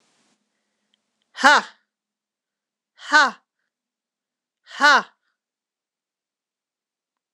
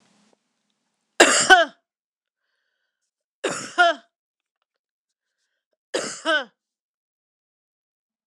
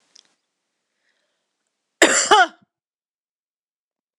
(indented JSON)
{
  "exhalation_length": "7.3 s",
  "exhalation_amplitude": 26028,
  "exhalation_signal_mean_std_ratio": 0.22,
  "three_cough_length": "8.3 s",
  "three_cough_amplitude": 26028,
  "three_cough_signal_mean_std_ratio": 0.25,
  "cough_length": "4.2 s",
  "cough_amplitude": 26028,
  "cough_signal_mean_std_ratio": 0.24,
  "survey_phase": "beta (2021-08-13 to 2022-03-07)",
  "age": "45-64",
  "gender": "Female",
  "wearing_mask": "No",
  "symptom_cough_any": true,
  "symptom_runny_or_blocked_nose": true,
  "symptom_fatigue": true,
  "smoker_status": "Never smoked",
  "respiratory_condition_asthma": true,
  "respiratory_condition_other": false,
  "recruitment_source": "Test and Trace",
  "submission_delay": "2 days",
  "covid_test_result": "Positive",
  "covid_test_method": "LFT"
}